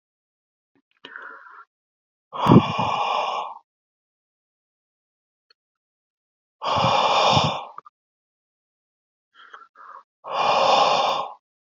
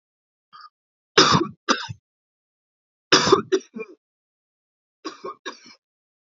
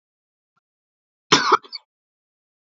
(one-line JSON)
{"exhalation_length": "11.7 s", "exhalation_amplitude": 26397, "exhalation_signal_mean_std_ratio": 0.4, "three_cough_length": "6.3 s", "three_cough_amplitude": 28527, "three_cough_signal_mean_std_ratio": 0.28, "cough_length": "2.7 s", "cough_amplitude": 29551, "cough_signal_mean_std_ratio": 0.22, "survey_phase": "beta (2021-08-13 to 2022-03-07)", "age": "18-44", "gender": "Male", "wearing_mask": "No", "symptom_none": true, "smoker_status": "Never smoked", "respiratory_condition_asthma": false, "respiratory_condition_other": false, "recruitment_source": "REACT", "submission_delay": "3 days", "covid_test_result": "Negative", "covid_test_method": "RT-qPCR", "influenza_a_test_result": "Negative", "influenza_b_test_result": "Negative"}